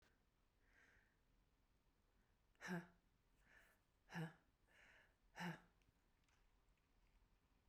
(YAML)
exhalation_length: 7.7 s
exhalation_amplitude: 377
exhalation_signal_mean_std_ratio: 0.33
survey_phase: beta (2021-08-13 to 2022-03-07)
age: 45-64
gender: Female
wearing_mask: 'No'
symptom_runny_or_blocked_nose: true
symptom_fatigue: true
symptom_headache: true
symptom_onset: 3 days
smoker_status: Never smoked
respiratory_condition_asthma: false
respiratory_condition_other: false
recruitment_source: Test and Trace
submission_delay: 2 days
covid_test_result: Negative
covid_test_method: RT-qPCR